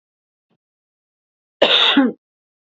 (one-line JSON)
{"cough_length": "2.6 s", "cough_amplitude": 32768, "cough_signal_mean_std_ratio": 0.35, "survey_phase": "beta (2021-08-13 to 2022-03-07)", "age": "18-44", "gender": "Female", "wearing_mask": "No", "symptom_cough_any": true, "symptom_new_continuous_cough": true, "symptom_runny_or_blocked_nose": true, "symptom_sore_throat": true, "symptom_fatigue": true, "symptom_other": true, "symptom_onset": "6 days", "smoker_status": "Never smoked", "respiratory_condition_asthma": false, "respiratory_condition_other": false, "recruitment_source": "Test and Trace", "submission_delay": "1 day", "covid_test_result": "Positive", "covid_test_method": "RT-qPCR", "covid_ct_value": 20.6, "covid_ct_gene": "N gene", "covid_ct_mean": 21.2, "covid_viral_load": "110000 copies/ml", "covid_viral_load_category": "Low viral load (10K-1M copies/ml)"}